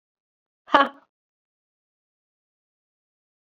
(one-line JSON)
{"exhalation_length": "3.4 s", "exhalation_amplitude": 28056, "exhalation_signal_mean_std_ratio": 0.14, "survey_phase": "beta (2021-08-13 to 2022-03-07)", "age": "45-64", "gender": "Female", "wearing_mask": "No", "symptom_cough_any": true, "symptom_new_continuous_cough": true, "symptom_runny_or_blocked_nose": true, "symptom_shortness_of_breath": true, "symptom_fatigue": true, "symptom_headache": true, "symptom_change_to_sense_of_smell_or_taste": true, "symptom_loss_of_taste": true, "symptom_onset": "4 days", "smoker_status": "Never smoked", "respiratory_condition_asthma": true, "respiratory_condition_other": false, "recruitment_source": "Test and Trace", "submission_delay": "2 days", "covid_test_result": "Positive", "covid_test_method": "RT-qPCR", "covid_ct_value": 16.9, "covid_ct_gene": "ORF1ab gene", "covid_ct_mean": 17.2, "covid_viral_load": "2200000 copies/ml", "covid_viral_load_category": "High viral load (>1M copies/ml)"}